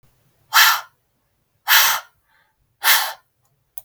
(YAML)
exhalation_length: 3.8 s
exhalation_amplitude: 32768
exhalation_signal_mean_std_ratio: 0.37
survey_phase: beta (2021-08-13 to 2022-03-07)
age: 18-44
gender: Female
wearing_mask: 'No'
symptom_none: true
smoker_status: Never smoked
respiratory_condition_asthma: false
respiratory_condition_other: false
recruitment_source: REACT
submission_delay: 1 day
covid_test_result: Negative
covid_test_method: RT-qPCR
influenza_a_test_result: Negative
influenza_b_test_result: Negative